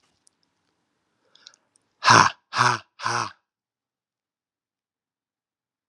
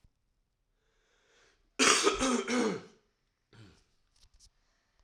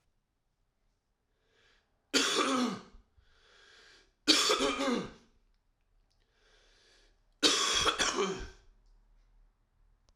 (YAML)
exhalation_length: 5.9 s
exhalation_amplitude: 30885
exhalation_signal_mean_std_ratio: 0.24
cough_length: 5.0 s
cough_amplitude: 15661
cough_signal_mean_std_ratio: 0.35
three_cough_length: 10.2 s
three_cough_amplitude: 10256
three_cough_signal_mean_std_ratio: 0.4
survey_phase: alpha (2021-03-01 to 2021-08-12)
age: 18-44
gender: Male
wearing_mask: 'No'
symptom_cough_any: true
symptom_shortness_of_breath: true
symptom_fatigue: true
symptom_fever_high_temperature: true
symptom_headache: true
symptom_change_to_sense_of_smell_or_taste: true
symptom_loss_of_taste: true
symptom_onset: 4 days
smoker_status: Never smoked
respiratory_condition_asthma: false
respiratory_condition_other: false
recruitment_source: Test and Trace
submission_delay: 2 days
covid_test_result: Positive
covid_test_method: RT-qPCR
covid_ct_value: 12.4
covid_ct_gene: ORF1ab gene
covid_ct_mean: 12.6
covid_viral_load: 74000000 copies/ml
covid_viral_load_category: High viral load (>1M copies/ml)